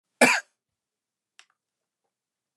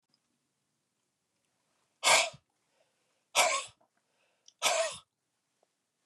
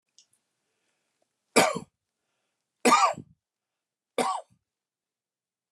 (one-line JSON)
{"cough_length": "2.6 s", "cough_amplitude": 22000, "cough_signal_mean_std_ratio": 0.2, "exhalation_length": "6.1 s", "exhalation_amplitude": 9506, "exhalation_signal_mean_std_ratio": 0.28, "three_cough_length": "5.7 s", "three_cough_amplitude": 17821, "three_cough_signal_mean_std_ratio": 0.26, "survey_phase": "beta (2021-08-13 to 2022-03-07)", "age": "45-64", "gender": "Male", "wearing_mask": "No", "symptom_none": true, "smoker_status": "Ex-smoker", "respiratory_condition_asthma": false, "respiratory_condition_other": false, "recruitment_source": "REACT", "submission_delay": "4 days", "covid_test_result": "Negative", "covid_test_method": "RT-qPCR", "influenza_a_test_result": "Negative", "influenza_b_test_result": "Negative"}